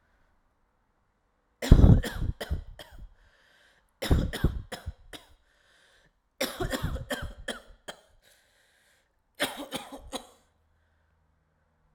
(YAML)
three_cough_length: 11.9 s
three_cough_amplitude: 23622
three_cough_signal_mean_std_ratio: 0.27
survey_phase: alpha (2021-03-01 to 2021-08-12)
age: 18-44
gender: Male
wearing_mask: 'No'
symptom_cough_any: true
symptom_fatigue: true
symptom_change_to_sense_of_smell_or_taste: true
symptom_loss_of_taste: true
symptom_onset: 4 days
smoker_status: Never smoked
respiratory_condition_asthma: false
respiratory_condition_other: false
recruitment_source: Test and Trace
submission_delay: 2 days
covid_test_result: Positive
covid_test_method: RT-qPCR